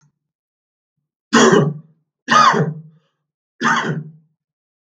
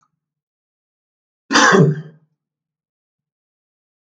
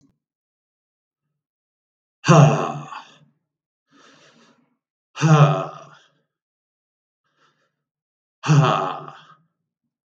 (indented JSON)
{
  "three_cough_length": "4.9 s",
  "three_cough_amplitude": 32768,
  "three_cough_signal_mean_std_ratio": 0.4,
  "cough_length": "4.2 s",
  "cough_amplitude": 32768,
  "cough_signal_mean_std_ratio": 0.27,
  "exhalation_length": "10.1 s",
  "exhalation_amplitude": 32748,
  "exhalation_signal_mean_std_ratio": 0.29,
  "survey_phase": "beta (2021-08-13 to 2022-03-07)",
  "age": "45-64",
  "gender": "Male",
  "wearing_mask": "No",
  "symptom_none": true,
  "smoker_status": "Never smoked",
  "respiratory_condition_asthma": true,
  "respiratory_condition_other": false,
  "recruitment_source": "REACT",
  "submission_delay": "1 day",
  "covid_test_result": "Negative",
  "covid_test_method": "RT-qPCR",
  "influenza_a_test_result": "Negative",
  "influenza_b_test_result": "Negative"
}